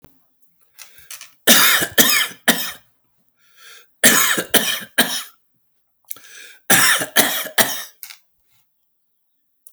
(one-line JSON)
{"three_cough_length": "9.7 s", "three_cough_amplitude": 32768, "three_cough_signal_mean_std_ratio": 0.4, "survey_phase": "alpha (2021-03-01 to 2021-08-12)", "age": "45-64", "gender": "Male", "wearing_mask": "No", "symptom_fatigue": true, "symptom_loss_of_taste": true, "symptom_onset": "8 days", "smoker_status": "Current smoker (11 or more cigarettes per day)", "respiratory_condition_asthma": false, "respiratory_condition_other": false, "recruitment_source": "REACT", "submission_delay": "3 days", "covid_test_result": "Negative", "covid_test_method": "RT-qPCR"}